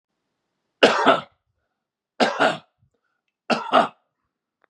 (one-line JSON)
{"three_cough_length": "4.7 s", "three_cough_amplitude": 32412, "three_cough_signal_mean_std_ratio": 0.33, "survey_phase": "beta (2021-08-13 to 2022-03-07)", "age": "45-64", "gender": "Male", "wearing_mask": "No", "symptom_none": true, "smoker_status": "Never smoked", "respiratory_condition_asthma": false, "respiratory_condition_other": false, "recruitment_source": "REACT", "submission_delay": "1 day", "covid_test_result": "Negative", "covid_test_method": "RT-qPCR", "influenza_a_test_result": "Negative", "influenza_b_test_result": "Negative"}